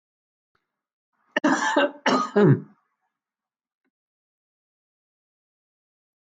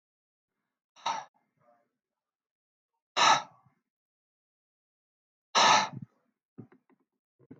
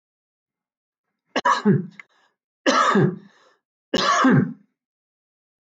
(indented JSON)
{
  "cough_length": "6.2 s",
  "cough_amplitude": 15490,
  "cough_signal_mean_std_ratio": 0.3,
  "exhalation_length": "7.6 s",
  "exhalation_amplitude": 11682,
  "exhalation_signal_mean_std_ratio": 0.24,
  "three_cough_length": "5.7 s",
  "three_cough_amplitude": 18954,
  "three_cough_signal_mean_std_ratio": 0.42,
  "survey_phase": "alpha (2021-03-01 to 2021-08-12)",
  "age": "45-64",
  "gender": "Male",
  "wearing_mask": "No",
  "symptom_none": true,
  "smoker_status": "Never smoked",
  "respiratory_condition_asthma": true,
  "respiratory_condition_other": false,
  "recruitment_source": "REACT",
  "submission_delay": "2 days",
  "covid_test_result": "Negative",
  "covid_test_method": "RT-qPCR"
}